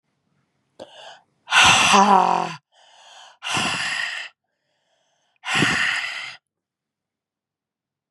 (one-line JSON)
{"exhalation_length": "8.1 s", "exhalation_amplitude": 28471, "exhalation_signal_mean_std_ratio": 0.41, "survey_phase": "beta (2021-08-13 to 2022-03-07)", "age": "45-64", "gender": "Female", "wearing_mask": "No", "symptom_cough_any": true, "symptom_fatigue": true, "symptom_headache": true, "smoker_status": "Never smoked", "respiratory_condition_asthma": false, "respiratory_condition_other": false, "recruitment_source": "Test and Trace", "submission_delay": "2 days", "covid_test_result": "Positive", "covid_test_method": "LFT"}